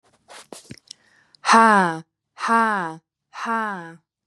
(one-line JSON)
{"exhalation_length": "4.3 s", "exhalation_amplitude": 30335, "exhalation_signal_mean_std_ratio": 0.39, "survey_phase": "beta (2021-08-13 to 2022-03-07)", "age": "18-44", "gender": "Female", "wearing_mask": "No", "symptom_other": true, "smoker_status": "Never smoked", "respiratory_condition_asthma": false, "respiratory_condition_other": false, "recruitment_source": "Test and Trace", "submission_delay": "1 day", "covid_test_result": "Positive", "covid_test_method": "RT-qPCR", "covid_ct_value": 32.2, "covid_ct_gene": "N gene", "covid_ct_mean": 32.3, "covid_viral_load": "26 copies/ml", "covid_viral_load_category": "Minimal viral load (< 10K copies/ml)"}